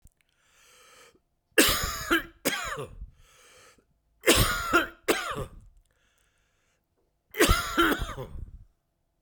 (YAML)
three_cough_length: 9.2 s
three_cough_amplitude: 20276
three_cough_signal_mean_std_ratio: 0.4
survey_phase: beta (2021-08-13 to 2022-03-07)
age: 45-64
gender: Male
wearing_mask: 'No'
symptom_cough_any: true
symptom_runny_or_blocked_nose: true
symptom_change_to_sense_of_smell_or_taste: true
smoker_status: Never smoked
respiratory_condition_asthma: false
respiratory_condition_other: false
recruitment_source: Test and Trace
submission_delay: 2 days
covid_test_result: Positive
covid_test_method: RT-qPCR
covid_ct_value: 19.8
covid_ct_gene: ORF1ab gene